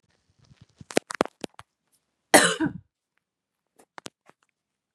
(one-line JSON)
{"cough_length": "4.9 s", "cough_amplitude": 32767, "cough_signal_mean_std_ratio": 0.19, "survey_phase": "beta (2021-08-13 to 2022-03-07)", "age": "45-64", "gender": "Female", "wearing_mask": "No", "symptom_none": true, "smoker_status": "Current smoker (e-cigarettes or vapes only)", "respiratory_condition_asthma": false, "respiratory_condition_other": false, "recruitment_source": "Test and Trace", "submission_delay": "0 days", "covid_test_result": "Negative", "covid_test_method": "LFT"}